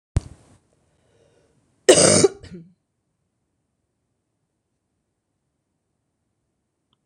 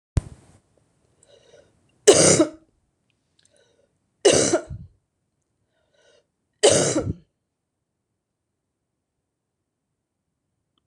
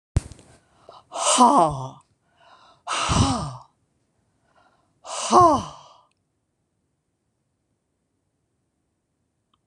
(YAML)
cough_length: 7.1 s
cough_amplitude: 26028
cough_signal_mean_std_ratio: 0.2
three_cough_length: 10.9 s
three_cough_amplitude: 26028
three_cough_signal_mean_std_ratio: 0.26
exhalation_length: 9.7 s
exhalation_amplitude: 25060
exhalation_signal_mean_std_ratio: 0.32
survey_phase: beta (2021-08-13 to 2022-03-07)
age: 65+
gender: Female
wearing_mask: 'No'
symptom_none: true
smoker_status: Never smoked
respiratory_condition_asthma: false
respiratory_condition_other: false
recruitment_source: REACT
submission_delay: 1 day
covid_test_result: Negative
covid_test_method: RT-qPCR